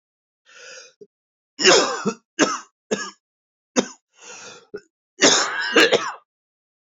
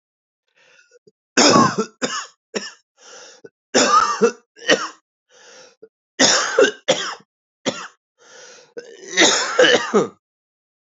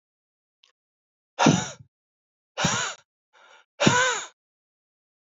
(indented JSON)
{
  "cough_length": "6.9 s",
  "cough_amplitude": 29914,
  "cough_signal_mean_std_ratio": 0.37,
  "three_cough_length": "10.8 s",
  "three_cough_amplitude": 32125,
  "three_cough_signal_mean_std_ratio": 0.42,
  "exhalation_length": "5.3 s",
  "exhalation_amplitude": 22145,
  "exhalation_signal_mean_std_ratio": 0.33,
  "survey_phase": "beta (2021-08-13 to 2022-03-07)",
  "age": "18-44",
  "gender": "Male",
  "wearing_mask": "No",
  "symptom_cough_any": true,
  "symptom_new_continuous_cough": true,
  "symptom_runny_or_blocked_nose": true,
  "symptom_sore_throat": true,
  "symptom_fatigue": true,
  "symptom_headache": true,
  "symptom_change_to_sense_of_smell_or_taste": true,
  "symptom_loss_of_taste": true,
  "symptom_onset": "7 days",
  "smoker_status": "Never smoked",
  "respiratory_condition_asthma": false,
  "respiratory_condition_other": false,
  "recruitment_source": "Test and Trace",
  "submission_delay": "3 days",
  "covid_test_result": "Positive",
  "covid_test_method": "RT-qPCR"
}